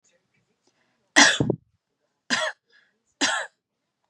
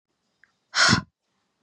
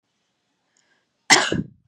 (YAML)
three_cough_length: 4.1 s
three_cough_amplitude: 31129
three_cough_signal_mean_std_ratio: 0.3
exhalation_length: 1.6 s
exhalation_amplitude: 17647
exhalation_signal_mean_std_ratio: 0.32
cough_length: 1.9 s
cough_amplitude: 32767
cough_signal_mean_std_ratio: 0.27
survey_phase: beta (2021-08-13 to 2022-03-07)
age: 18-44
gender: Female
wearing_mask: 'No'
symptom_none: true
smoker_status: Never smoked
respiratory_condition_asthma: false
respiratory_condition_other: false
recruitment_source: REACT
submission_delay: 2 days
covid_test_result: Negative
covid_test_method: RT-qPCR
influenza_a_test_result: Negative
influenza_b_test_result: Negative